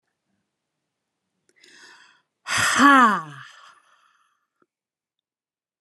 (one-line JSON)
{"exhalation_length": "5.8 s", "exhalation_amplitude": 28630, "exhalation_signal_mean_std_ratio": 0.27, "survey_phase": "beta (2021-08-13 to 2022-03-07)", "age": "45-64", "gender": "Female", "wearing_mask": "No", "symptom_runny_or_blocked_nose": true, "symptom_headache": true, "symptom_change_to_sense_of_smell_or_taste": true, "symptom_loss_of_taste": true, "symptom_onset": "3 days", "smoker_status": "Never smoked", "respiratory_condition_asthma": false, "respiratory_condition_other": false, "recruitment_source": "Test and Trace", "submission_delay": "2 days", "covid_test_result": "Positive", "covid_test_method": "RT-qPCR"}